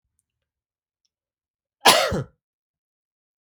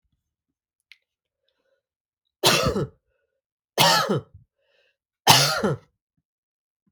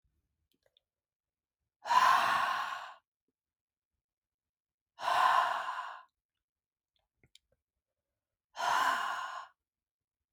{
  "cough_length": "3.5 s",
  "cough_amplitude": 32766,
  "cough_signal_mean_std_ratio": 0.22,
  "three_cough_length": "6.9 s",
  "three_cough_amplitude": 32441,
  "three_cough_signal_mean_std_ratio": 0.33,
  "exhalation_length": "10.3 s",
  "exhalation_amplitude": 7546,
  "exhalation_signal_mean_std_ratio": 0.38,
  "survey_phase": "beta (2021-08-13 to 2022-03-07)",
  "age": "18-44",
  "gender": "Male",
  "wearing_mask": "No",
  "symptom_runny_or_blocked_nose": true,
  "smoker_status": "Never smoked",
  "respiratory_condition_asthma": false,
  "respiratory_condition_other": false,
  "recruitment_source": "REACT",
  "submission_delay": "22 days",
  "covid_test_result": "Negative",
  "covid_test_method": "RT-qPCR",
  "influenza_a_test_result": "Negative",
  "influenza_b_test_result": "Negative"
}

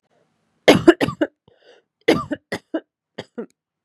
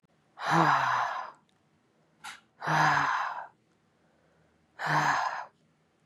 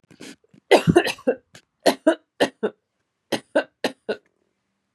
{
  "cough_length": "3.8 s",
  "cough_amplitude": 32768,
  "cough_signal_mean_std_ratio": 0.27,
  "exhalation_length": "6.1 s",
  "exhalation_amplitude": 11279,
  "exhalation_signal_mean_std_ratio": 0.51,
  "three_cough_length": "4.9 s",
  "three_cough_amplitude": 27595,
  "three_cough_signal_mean_std_ratio": 0.31,
  "survey_phase": "beta (2021-08-13 to 2022-03-07)",
  "age": "18-44",
  "gender": "Female",
  "wearing_mask": "No",
  "symptom_cough_any": true,
  "symptom_onset": "3 days",
  "smoker_status": "Never smoked",
  "respiratory_condition_asthma": false,
  "respiratory_condition_other": false,
  "recruitment_source": "REACT",
  "submission_delay": "4 days",
  "covid_test_result": "Negative",
  "covid_test_method": "RT-qPCR",
  "influenza_a_test_result": "Negative",
  "influenza_b_test_result": "Negative"
}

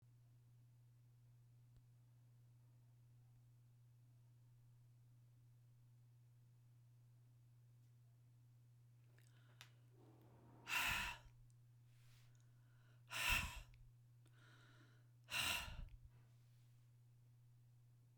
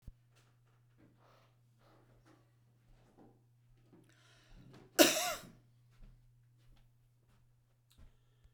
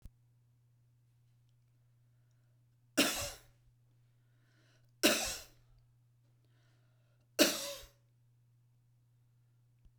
{
  "exhalation_length": "18.2 s",
  "exhalation_amplitude": 1515,
  "exhalation_signal_mean_std_ratio": 0.39,
  "cough_length": "8.5 s",
  "cough_amplitude": 12016,
  "cough_signal_mean_std_ratio": 0.18,
  "three_cough_length": "10.0 s",
  "three_cough_amplitude": 8941,
  "three_cough_signal_mean_std_ratio": 0.24,
  "survey_phase": "beta (2021-08-13 to 2022-03-07)",
  "age": "65+",
  "gender": "Female",
  "wearing_mask": "No",
  "symptom_none": true,
  "symptom_onset": "12 days",
  "smoker_status": "Ex-smoker",
  "respiratory_condition_asthma": false,
  "respiratory_condition_other": false,
  "recruitment_source": "REACT",
  "submission_delay": "11 days",
  "covid_test_result": "Negative",
  "covid_test_method": "RT-qPCR"
}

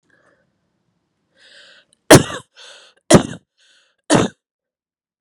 {
  "three_cough_length": "5.2 s",
  "three_cough_amplitude": 32768,
  "three_cough_signal_mean_std_ratio": 0.22,
  "survey_phase": "beta (2021-08-13 to 2022-03-07)",
  "age": "18-44",
  "gender": "Female",
  "wearing_mask": "No",
  "symptom_cough_any": true,
  "symptom_runny_or_blocked_nose": true,
  "symptom_headache": true,
  "smoker_status": "Never smoked",
  "respiratory_condition_asthma": false,
  "respiratory_condition_other": false,
  "recruitment_source": "Test and Trace",
  "submission_delay": "2 days",
  "covid_test_result": "Positive",
  "covid_test_method": "RT-qPCR",
  "covid_ct_value": 16.0,
  "covid_ct_gene": "ORF1ab gene",
  "covid_ct_mean": 16.3,
  "covid_viral_load": "4500000 copies/ml",
  "covid_viral_load_category": "High viral load (>1M copies/ml)"
}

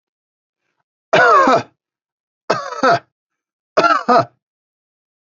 {
  "three_cough_length": "5.4 s",
  "three_cough_amplitude": 32767,
  "three_cough_signal_mean_std_ratio": 0.39,
  "survey_phase": "beta (2021-08-13 to 2022-03-07)",
  "age": "45-64",
  "gender": "Male",
  "wearing_mask": "No",
  "symptom_none": true,
  "smoker_status": "Never smoked",
  "respiratory_condition_asthma": false,
  "respiratory_condition_other": false,
  "recruitment_source": "Test and Trace",
  "submission_delay": "1 day",
  "covid_test_result": "Negative",
  "covid_test_method": "ePCR"
}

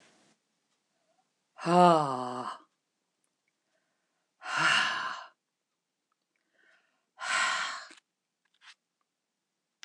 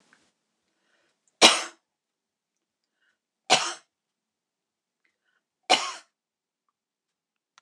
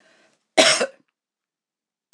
{
  "exhalation_length": "9.8 s",
  "exhalation_amplitude": 12504,
  "exhalation_signal_mean_std_ratio": 0.31,
  "three_cough_length": "7.6 s",
  "three_cough_amplitude": 26027,
  "three_cough_signal_mean_std_ratio": 0.18,
  "cough_length": "2.1 s",
  "cough_amplitude": 26028,
  "cough_signal_mean_std_ratio": 0.28,
  "survey_phase": "beta (2021-08-13 to 2022-03-07)",
  "age": "65+",
  "gender": "Female",
  "wearing_mask": "No",
  "symptom_none": true,
  "smoker_status": "Never smoked",
  "respiratory_condition_asthma": false,
  "respiratory_condition_other": false,
  "recruitment_source": "REACT",
  "submission_delay": "2 days",
  "covid_test_result": "Negative",
  "covid_test_method": "RT-qPCR",
  "influenza_a_test_result": "Negative",
  "influenza_b_test_result": "Negative"
}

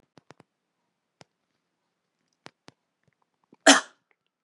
{
  "cough_length": "4.4 s",
  "cough_amplitude": 29518,
  "cough_signal_mean_std_ratio": 0.13,
  "survey_phase": "beta (2021-08-13 to 2022-03-07)",
  "age": "18-44",
  "gender": "Female",
  "wearing_mask": "No",
  "symptom_runny_or_blocked_nose": true,
  "symptom_sore_throat": true,
  "symptom_fatigue": true,
  "symptom_change_to_sense_of_smell_or_taste": true,
  "symptom_onset": "5 days",
  "smoker_status": "Never smoked",
  "respiratory_condition_asthma": false,
  "respiratory_condition_other": false,
  "recruitment_source": "Test and Trace",
  "submission_delay": "2 days",
  "covid_test_result": "Positive",
  "covid_test_method": "RT-qPCR",
  "covid_ct_value": 24.3,
  "covid_ct_gene": "ORF1ab gene",
  "covid_ct_mean": 24.3,
  "covid_viral_load": "11000 copies/ml",
  "covid_viral_load_category": "Low viral load (10K-1M copies/ml)"
}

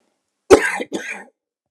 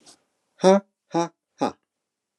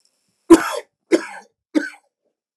{
  "cough_length": "1.7 s",
  "cough_amplitude": 29204,
  "cough_signal_mean_std_ratio": 0.31,
  "exhalation_length": "2.4 s",
  "exhalation_amplitude": 22620,
  "exhalation_signal_mean_std_ratio": 0.28,
  "three_cough_length": "2.6 s",
  "three_cough_amplitude": 29204,
  "three_cough_signal_mean_std_ratio": 0.26,
  "survey_phase": "beta (2021-08-13 to 2022-03-07)",
  "age": "45-64",
  "gender": "Male",
  "wearing_mask": "No",
  "symptom_none": true,
  "smoker_status": "Never smoked",
  "respiratory_condition_asthma": false,
  "respiratory_condition_other": false,
  "recruitment_source": "REACT",
  "submission_delay": "1 day",
  "covid_test_result": "Negative",
  "covid_test_method": "RT-qPCR",
  "influenza_a_test_result": "Negative",
  "influenza_b_test_result": "Negative"
}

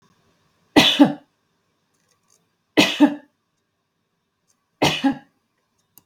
{
  "three_cough_length": "6.1 s",
  "three_cough_amplitude": 32768,
  "three_cough_signal_mean_std_ratio": 0.29,
  "survey_phase": "beta (2021-08-13 to 2022-03-07)",
  "age": "45-64",
  "gender": "Female",
  "wearing_mask": "No",
  "symptom_none": true,
  "smoker_status": "Never smoked",
  "respiratory_condition_asthma": false,
  "respiratory_condition_other": false,
  "recruitment_source": "REACT",
  "submission_delay": "2 days",
  "covid_test_result": "Negative",
  "covid_test_method": "RT-qPCR"
}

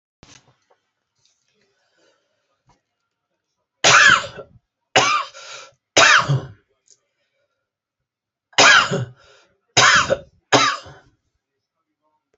{
  "cough_length": "12.4 s",
  "cough_amplitude": 30919,
  "cough_signal_mean_std_ratio": 0.33,
  "survey_phase": "alpha (2021-03-01 to 2021-08-12)",
  "age": "45-64",
  "gender": "Male",
  "wearing_mask": "No",
  "symptom_none": true,
  "smoker_status": "Never smoked",
  "respiratory_condition_asthma": false,
  "respiratory_condition_other": false,
  "recruitment_source": "REACT",
  "submission_delay": "2 days",
  "covid_test_result": "Negative",
  "covid_test_method": "RT-qPCR"
}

